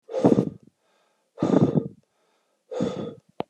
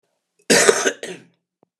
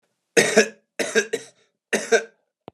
{"exhalation_length": "3.5 s", "exhalation_amplitude": 21521, "exhalation_signal_mean_std_ratio": 0.4, "cough_length": "1.8 s", "cough_amplitude": 32768, "cough_signal_mean_std_ratio": 0.38, "three_cough_length": "2.7 s", "three_cough_amplitude": 29034, "three_cough_signal_mean_std_ratio": 0.38, "survey_phase": "beta (2021-08-13 to 2022-03-07)", "age": "45-64", "gender": "Male", "wearing_mask": "No", "symptom_cough_any": true, "symptom_runny_or_blocked_nose": true, "symptom_fatigue": true, "smoker_status": "Never smoked", "respiratory_condition_asthma": false, "respiratory_condition_other": false, "recruitment_source": "Test and Trace", "submission_delay": "2 days", "covid_test_result": "Positive", "covid_test_method": "RT-qPCR", "covid_ct_value": 15.7, "covid_ct_gene": "ORF1ab gene", "covid_ct_mean": 16.5, "covid_viral_load": "3800000 copies/ml", "covid_viral_load_category": "High viral load (>1M copies/ml)"}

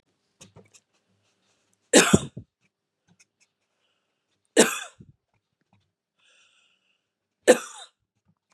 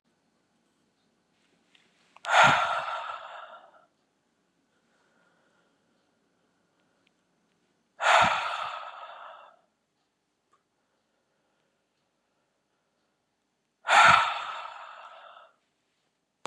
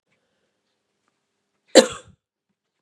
{"three_cough_length": "8.5 s", "three_cough_amplitude": 31186, "three_cough_signal_mean_std_ratio": 0.19, "exhalation_length": "16.5 s", "exhalation_amplitude": 16887, "exhalation_signal_mean_std_ratio": 0.27, "cough_length": "2.8 s", "cough_amplitude": 32768, "cough_signal_mean_std_ratio": 0.14, "survey_phase": "beta (2021-08-13 to 2022-03-07)", "age": "18-44", "gender": "Female", "wearing_mask": "No", "symptom_runny_or_blocked_nose": true, "smoker_status": "Never smoked", "respiratory_condition_asthma": false, "respiratory_condition_other": false, "recruitment_source": "REACT", "submission_delay": "1 day", "covid_test_result": "Negative", "covid_test_method": "RT-qPCR", "influenza_a_test_result": "Negative", "influenza_b_test_result": "Negative"}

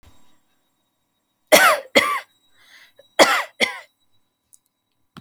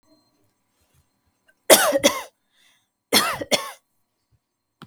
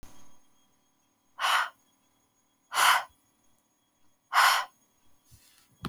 {"cough_length": "5.2 s", "cough_amplitude": 32768, "cough_signal_mean_std_ratio": 0.3, "three_cough_length": "4.9 s", "three_cough_amplitude": 32768, "three_cough_signal_mean_std_ratio": 0.29, "exhalation_length": "5.9 s", "exhalation_amplitude": 11505, "exhalation_signal_mean_std_ratio": 0.33, "survey_phase": "alpha (2021-03-01 to 2021-08-12)", "age": "18-44", "gender": "Female", "wearing_mask": "No", "symptom_none": true, "smoker_status": "Never smoked", "respiratory_condition_asthma": false, "respiratory_condition_other": false, "recruitment_source": "REACT", "submission_delay": "1 day", "covid_test_result": "Negative", "covid_test_method": "RT-qPCR"}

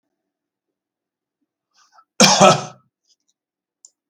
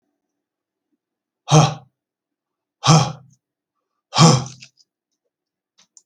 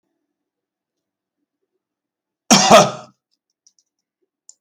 {"three_cough_length": "4.1 s", "three_cough_amplitude": 32768, "three_cough_signal_mean_std_ratio": 0.24, "exhalation_length": "6.1 s", "exhalation_amplitude": 32768, "exhalation_signal_mean_std_ratio": 0.27, "cough_length": "4.6 s", "cough_amplitude": 32768, "cough_signal_mean_std_ratio": 0.23, "survey_phase": "beta (2021-08-13 to 2022-03-07)", "age": "65+", "gender": "Male", "wearing_mask": "No", "symptom_none": true, "smoker_status": "Never smoked", "respiratory_condition_asthma": false, "respiratory_condition_other": false, "recruitment_source": "REACT", "submission_delay": "2 days", "covid_test_result": "Negative", "covid_test_method": "RT-qPCR", "influenza_a_test_result": "Negative", "influenza_b_test_result": "Negative"}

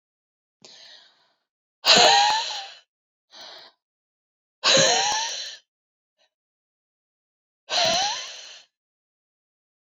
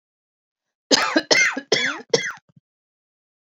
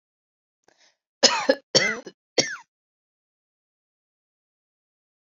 {"exhalation_length": "10.0 s", "exhalation_amplitude": 25764, "exhalation_signal_mean_std_ratio": 0.35, "cough_length": "3.4 s", "cough_amplitude": 32274, "cough_signal_mean_std_ratio": 0.4, "three_cough_length": "5.4 s", "three_cough_amplitude": 31366, "three_cough_signal_mean_std_ratio": 0.23, "survey_phase": "beta (2021-08-13 to 2022-03-07)", "age": "45-64", "gender": "Female", "wearing_mask": "No", "symptom_none": true, "smoker_status": "Ex-smoker", "respiratory_condition_asthma": true, "respiratory_condition_other": false, "recruitment_source": "REACT", "submission_delay": "1 day", "covid_test_result": "Negative", "covid_test_method": "RT-qPCR"}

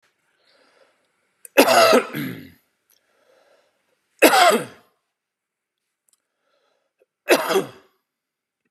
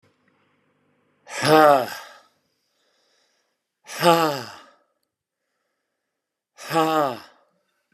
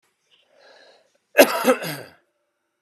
{"three_cough_length": "8.7 s", "three_cough_amplitude": 32465, "three_cough_signal_mean_std_ratio": 0.3, "exhalation_length": "7.9 s", "exhalation_amplitude": 28727, "exhalation_signal_mean_std_ratio": 0.3, "cough_length": "2.8 s", "cough_amplitude": 32768, "cough_signal_mean_std_ratio": 0.27, "survey_phase": "beta (2021-08-13 to 2022-03-07)", "age": "45-64", "gender": "Male", "wearing_mask": "No", "symptom_cough_any": true, "symptom_change_to_sense_of_smell_or_taste": true, "symptom_onset": "11 days", "smoker_status": "Never smoked", "respiratory_condition_asthma": false, "respiratory_condition_other": false, "recruitment_source": "REACT", "submission_delay": "1 day", "covid_test_result": "Negative", "covid_test_method": "RT-qPCR"}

